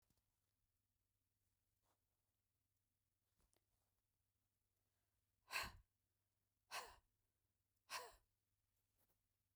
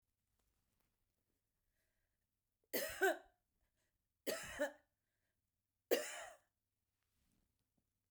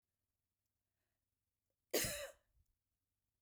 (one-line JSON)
{"exhalation_length": "9.6 s", "exhalation_amplitude": 820, "exhalation_signal_mean_std_ratio": 0.21, "three_cough_length": "8.1 s", "three_cough_amplitude": 2829, "three_cough_signal_mean_std_ratio": 0.25, "cough_length": "3.4 s", "cough_amplitude": 2039, "cough_signal_mean_std_ratio": 0.24, "survey_phase": "beta (2021-08-13 to 2022-03-07)", "age": "45-64", "gender": "Female", "wearing_mask": "No", "symptom_cough_any": true, "smoker_status": "Ex-smoker", "respiratory_condition_asthma": false, "respiratory_condition_other": false, "recruitment_source": "Test and Trace", "submission_delay": "1 day", "covid_test_result": "Negative", "covid_test_method": "ePCR"}